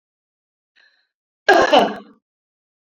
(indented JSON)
{
  "cough_length": "2.8 s",
  "cough_amplitude": 29920,
  "cough_signal_mean_std_ratio": 0.31,
  "survey_phase": "beta (2021-08-13 to 2022-03-07)",
  "age": "45-64",
  "gender": "Female",
  "wearing_mask": "No",
  "symptom_runny_or_blocked_nose": true,
  "symptom_other": true,
  "smoker_status": "Never smoked",
  "respiratory_condition_asthma": false,
  "respiratory_condition_other": false,
  "recruitment_source": "Test and Trace",
  "submission_delay": "2 days",
  "covid_test_result": "Positive",
  "covid_test_method": "ePCR"
}